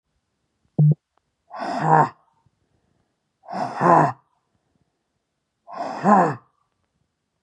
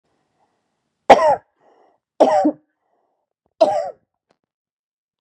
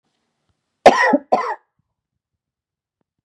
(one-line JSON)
{"exhalation_length": "7.4 s", "exhalation_amplitude": 26528, "exhalation_signal_mean_std_ratio": 0.35, "three_cough_length": "5.2 s", "three_cough_amplitude": 32768, "three_cough_signal_mean_std_ratio": 0.29, "cough_length": "3.2 s", "cough_amplitude": 32768, "cough_signal_mean_std_ratio": 0.27, "survey_phase": "beta (2021-08-13 to 2022-03-07)", "age": "45-64", "gender": "Female", "wearing_mask": "No", "symptom_cough_any": true, "symptom_runny_or_blocked_nose": true, "symptom_fever_high_temperature": true, "symptom_headache": true, "symptom_onset": "2 days", "smoker_status": "Current smoker (11 or more cigarettes per day)", "respiratory_condition_asthma": false, "respiratory_condition_other": false, "recruitment_source": "Test and Trace", "submission_delay": "1 day", "covid_test_result": "Negative", "covid_test_method": "RT-qPCR"}